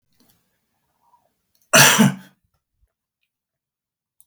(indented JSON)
{
  "cough_length": "4.3 s",
  "cough_amplitude": 32768,
  "cough_signal_mean_std_ratio": 0.24,
  "survey_phase": "beta (2021-08-13 to 2022-03-07)",
  "age": "65+",
  "gender": "Male",
  "wearing_mask": "No",
  "symptom_none": true,
  "smoker_status": "Current smoker (1 to 10 cigarettes per day)",
  "respiratory_condition_asthma": false,
  "respiratory_condition_other": false,
  "recruitment_source": "REACT",
  "submission_delay": "2 days",
  "covid_test_result": "Negative",
  "covid_test_method": "RT-qPCR",
  "influenza_a_test_result": "Negative",
  "influenza_b_test_result": "Negative"
}